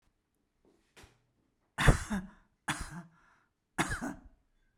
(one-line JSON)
{"three_cough_length": "4.8 s", "three_cough_amplitude": 12311, "three_cough_signal_mean_std_ratio": 0.28, "survey_phase": "beta (2021-08-13 to 2022-03-07)", "age": "65+", "gender": "Female", "wearing_mask": "No", "symptom_none": true, "smoker_status": "Ex-smoker", "respiratory_condition_asthma": false, "respiratory_condition_other": false, "recruitment_source": "Test and Trace", "submission_delay": "3 days", "covid_test_result": "Negative", "covid_test_method": "RT-qPCR"}